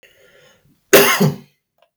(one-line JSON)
{"cough_length": "2.0 s", "cough_amplitude": 32768, "cough_signal_mean_std_ratio": 0.37, "survey_phase": "beta (2021-08-13 to 2022-03-07)", "age": "45-64", "gender": "Male", "wearing_mask": "No", "symptom_none": true, "smoker_status": "Ex-smoker", "respiratory_condition_asthma": false, "respiratory_condition_other": false, "recruitment_source": "REACT", "submission_delay": "1 day", "covid_test_result": "Negative", "covid_test_method": "RT-qPCR"}